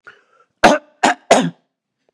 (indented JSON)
{
  "three_cough_length": "2.1 s",
  "three_cough_amplitude": 32768,
  "three_cough_signal_mean_std_ratio": 0.35,
  "survey_phase": "beta (2021-08-13 to 2022-03-07)",
  "age": "45-64",
  "gender": "Male",
  "wearing_mask": "No",
  "symptom_fatigue": true,
  "symptom_headache": true,
  "smoker_status": "Current smoker (11 or more cigarettes per day)",
  "respiratory_condition_asthma": false,
  "respiratory_condition_other": false,
  "recruitment_source": "Test and Trace",
  "submission_delay": "1 day",
  "covid_test_result": "Positive",
  "covid_test_method": "RT-qPCR",
  "covid_ct_value": 34.7,
  "covid_ct_gene": "N gene"
}